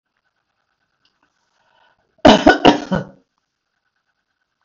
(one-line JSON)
{"cough_length": "4.6 s", "cough_amplitude": 32768, "cough_signal_mean_std_ratio": 0.24, "survey_phase": "beta (2021-08-13 to 2022-03-07)", "age": "65+", "gender": "Female", "wearing_mask": "No", "symptom_none": true, "smoker_status": "Never smoked", "respiratory_condition_asthma": false, "respiratory_condition_other": false, "recruitment_source": "REACT", "submission_delay": "2 days", "covid_test_result": "Negative", "covid_test_method": "RT-qPCR", "influenza_a_test_result": "Negative", "influenza_b_test_result": "Negative"}